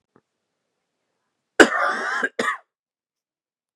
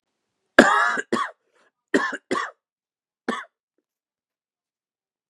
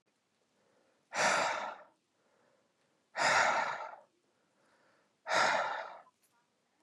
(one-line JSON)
{"cough_length": "3.8 s", "cough_amplitude": 32768, "cough_signal_mean_std_ratio": 0.28, "three_cough_length": "5.3 s", "three_cough_amplitude": 32768, "three_cough_signal_mean_std_ratio": 0.29, "exhalation_length": "6.8 s", "exhalation_amplitude": 4555, "exhalation_signal_mean_std_ratio": 0.42, "survey_phase": "beta (2021-08-13 to 2022-03-07)", "age": "18-44", "gender": "Male", "wearing_mask": "Yes", "symptom_cough_any": true, "symptom_shortness_of_breath": true, "symptom_fatigue": true, "symptom_fever_high_temperature": true, "symptom_headache": true, "symptom_change_to_sense_of_smell_or_taste": true, "symptom_loss_of_taste": true, "symptom_other": true, "symptom_onset": "5 days", "smoker_status": "Never smoked", "respiratory_condition_asthma": false, "respiratory_condition_other": false, "recruitment_source": "Test and Trace", "submission_delay": "2 days", "covid_test_result": "Positive", "covid_test_method": "RT-qPCR", "covid_ct_value": 12.0, "covid_ct_gene": "ORF1ab gene", "covid_ct_mean": 12.1, "covid_viral_load": "110000000 copies/ml", "covid_viral_load_category": "High viral load (>1M copies/ml)"}